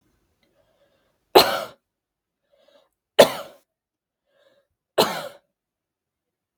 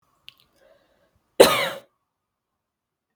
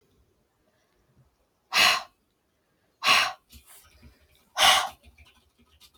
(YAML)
three_cough_length: 6.6 s
three_cough_amplitude: 32768
three_cough_signal_mean_std_ratio: 0.19
cough_length: 3.2 s
cough_amplitude: 32768
cough_signal_mean_std_ratio: 0.2
exhalation_length: 6.0 s
exhalation_amplitude: 19458
exhalation_signal_mean_std_ratio: 0.3
survey_phase: beta (2021-08-13 to 2022-03-07)
age: 18-44
gender: Female
wearing_mask: 'No'
symptom_sore_throat: true
symptom_onset: 2 days
smoker_status: Never smoked
respiratory_condition_asthma: false
respiratory_condition_other: false
recruitment_source: REACT
submission_delay: 1 day
covid_test_result: Negative
covid_test_method: RT-qPCR